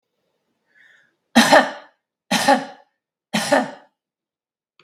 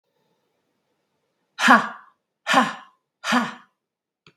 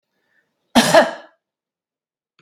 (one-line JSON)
{"three_cough_length": "4.8 s", "three_cough_amplitude": 32768, "three_cough_signal_mean_std_ratio": 0.33, "exhalation_length": "4.4 s", "exhalation_amplitude": 32768, "exhalation_signal_mean_std_ratio": 0.3, "cough_length": "2.4 s", "cough_amplitude": 32767, "cough_signal_mean_std_ratio": 0.29, "survey_phase": "beta (2021-08-13 to 2022-03-07)", "age": "65+", "gender": "Female", "wearing_mask": "No", "symptom_none": true, "smoker_status": "Never smoked", "respiratory_condition_asthma": false, "respiratory_condition_other": false, "recruitment_source": "REACT", "submission_delay": "1 day", "covid_test_result": "Negative", "covid_test_method": "RT-qPCR"}